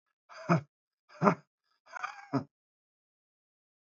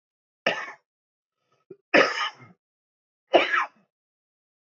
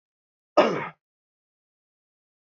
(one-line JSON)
{"exhalation_length": "3.9 s", "exhalation_amplitude": 17813, "exhalation_signal_mean_std_ratio": 0.25, "three_cough_length": "4.8 s", "three_cough_amplitude": 20408, "three_cough_signal_mean_std_ratio": 0.29, "cough_length": "2.6 s", "cough_amplitude": 19958, "cough_signal_mean_std_ratio": 0.22, "survey_phase": "beta (2021-08-13 to 2022-03-07)", "age": "18-44", "gender": "Male", "wearing_mask": "No", "symptom_cough_any": true, "symptom_new_continuous_cough": true, "symptom_runny_or_blocked_nose": true, "symptom_sore_throat": true, "symptom_fatigue": true, "symptom_headache": true, "symptom_change_to_sense_of_smell_or_taste": true, "smoker_status": "Never smoked", "respiratory_condition_asthma": false, "respiratory_condition_other": false, "recruitment_source": "Test and Trace", "submission_delay": "1 day", "covid_test_result": "Positive", "covid_test_method": "LFT"}